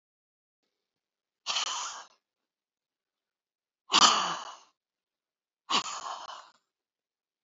{
  "exhalation_length": "7.4 s",
  "exhalation_amplitude": 16252,
  "exhalation_signal_mean_std_ratio": 0.28,
  "survey_phase": "beta (2021-08-13 to 2022-03-07)",
  "age": "65+",
  "gender": "Female",
  "wearing_mask": "No",
  "symptom_shortness_of_breath": true,
  "smoker_status": "Ex-smoker",
  "respiratory_condition_asthma": false,
  "respiratory_condition_other": true,
  "recruitment_source": "REACT",
  "submission_delay": "2 days",
  "covid_test_result": "Negative",
  "covid_test_method": "RT-qPCR",
  "influenza_a_test_result": "Negative",
  "influenza_b_test_result": "Negative"
}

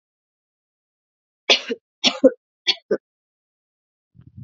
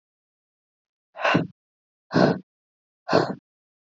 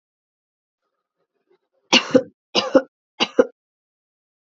{
  "cough_length": "4.4 s",
  "cough_amplitude": 32768,
  "cough_signal_mean_std_ratio": 0.22,
  "exhalation_length": "3.9 s",
  "exhalation_amplitude": 21277,
  "exhalation_signal_mean_std_ratio": 0.32,
  "three_cough_length": "4.4 s",
  "three_cough_amplitude": 29578,
  "three_cough_signal_mean_std_ratio": 0.24,
  "survey_phase": "alpha (2021-03-01 to 2021-08-12)",
  "age": "18-44",
  "gender": "Female",
  "wearing_mask": "No",
  "symptom_cough_any": true,
  "symptom_shortness_of_breath": true,
  "symptom_change_to_sense_of_smell_or_taste": true,
  "smoker_status": "Never smoked",
  "respiratory_condition_asthma": false,
  "respiratory_condition_other": false,
  "recruitment_source": "Test and Trace",
  "submission_delay": "2 days",
  "covid_test_result": "Positive",
  "covid_test_method": "RT-qPCR",
  "covid_ct_value": 22.0,
  "covid_ct_gene": "ORF1ab gene",
  "covid_ct_mean": 22.6,
  "covid_viral_load": "38000 copies/ml",
  "covid_viral_load_category": "Low viral load (10K-1M copies/ml)"
}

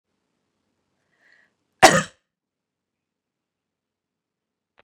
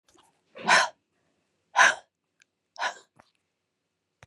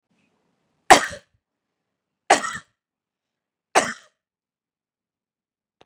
{
  "cough_length": "4.8 s",
  "cough_amplitude": 32768,
  "cough_signal_mean_std_ratio": 0.13,
  "exhalation_length": "4.3 s",
  "exhalation_amplitude": 18295,
  "exhalation_signal_mean_std_ratio": 0.26,
  "three_cough_length": "5.9 s",
  "three_cough_amplitude": 32768,
  "three_cough_signal_mean_std_ratio": 0.17,
  "survey_phase": "beta (2021-08-13 to 2022-03-07)",
  "age": "45-64",
  "gender": "Female",
  "wearing_mask": "No",
  "symptom_none": true,
  "smoker_status": "Never smoked",
  "respiratory_condition_asthma": false,
  "respiratory_condition_other": false,
  "recruitment_source": "REACT",
  "submission_delay": "1 day",
  "covid_test_result": "Negative",
  "covid_test_method": "RT-qPCR",
  "influenza_a_test_result": "Negative",
  "influenza_b_test_result": "Negative"
}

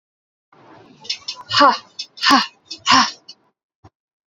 {
  "exhalation_length": "4.3 s",
  "exhalation_amplitude": 29314,
  "exhalation_signal_mean_std_ratio": 0.36,
  "survey_phase": "beta (2021-08-13 to 2022-03-07)",
  "age": "45-64",
  "gender": "Female",
  "wearing_mask": "No",
  "symptom_none": true,
  "smoker_status": "Never smoked",
  "respiratory_condition_asthma": false,
  "respiratory_condition_other": false,
  "recruitment_source": "REACT",
  "submission_delay": "8 days",
  "covid_test_result": "Negative",
  "covid_test_method": "RT-qPCR"
}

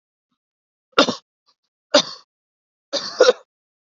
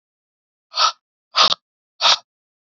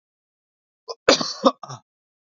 {
  "three_cough_length": "3.9 s",
  "three_cough_amplitude": 28721,
  "three_cough_signal_mean_std_ratio": 0.25,
  "exhalation_length": "2.6 s",
  "exhalation_amplitude": 31613,
  "exhalation_signal_mean_std_ratio": 0.32,
  "cough_length": "2.4 s",
  "cough_amplitude": 27703,
  "cough_signal_mean_std_ratio": 0.25,
  "survey_phase": "beta (2021-08-13 to 2022-03-07)",
  "age": "18-44",
  "gender": "Male",
  "wearing_mask": "No",
  "symptom_none": true,
  "smoker_status": "Current smoker (e-cigarettes or vapes only)",
  "respiratory_condition_asthma": false,
  "respiratory_condition_other": false,
  "recruitment_source": "REACT",
  "submission_delay": "2 days",
  "covid_test_result": "Negative",
  "covid_test_method": "RT-qPCR",
  "influenza_a_test_result": "Negative",
  "influenza_b_test_result": "Negative"
}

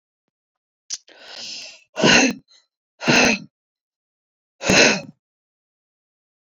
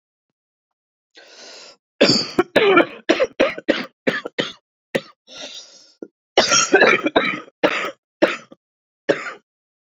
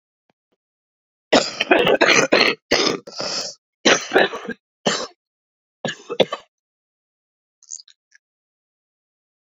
{
  "exhalation_length": "6.6 s",
  "exhalation_amplitude": 30508,
  "exhalation_signal_mean_std_ratio": 0.33,
  "cough_length": "9.9 s",
  "cough_amplitude": 32768,
  "cough_signal_mean_std_ratio": 0.41,
  "three_cough_length": "9.5 s",
  "three_cough_amplitude": 32768,
  "three_cough_signal_mean_std_ratio": 0.37,
  "survey_phase": "beta (2021-08-13 to 2022-03-07)",
  "age": "45-64",
  "gender": "Female",
  "wearing_mask": "No",
  "symptom_cough_any": true,
  "symptom_sore_throat": true,
  "symptom_abdominal_pain": true,
  "symptom_fatigue": true,
  "symptom_headache": true,
  "symptom_change_to_sense_of_smell_or_taste": true,
  "symptom_loss_of_taste": true,
  "symptom_onset": "4 days",
  "smoker_status": "Current smoker (11 or more cigarettes per day)",
  "respiratory_condition_asthma": false,
  "respiratory_condition_other": true,
  "recruitment_source": "Test and Trace",
  "submission_delay": "3 days",
  "covid_test_result": "Positive",
  "covid_test_method": "RT-qPCR",
  "covid_ct_value": 25.2,
  "covid_ct_gene": "ORF1ab gene",
  "covid_ct_mean": 25.5,
  "covid_viral_load": "4200 copies/ml",
  "covid_viral_load_category": "Minimal viral load (< 10K copies/ml)"
}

